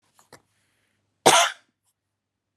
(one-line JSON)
{"cough_length": "2.6 s", "cough_amplitude": 30435, "cough_signal_mean_std_ratio": 0.24, "survey_phase": "alpha (2021-03-01 to 2021-08-12)", "age": "45-64", "gender": "Female", "wearing_mask": "No", "symptom_none": true, "smoker_status": "Never smoked", "respiratory_condition_asthma": false, "respiratory_condition_other": false, "recruitment_source": "REACT", "submission_delay": "2 days", "covid_test_result": "Negative", "covid_test_method": "RT-qPCR"}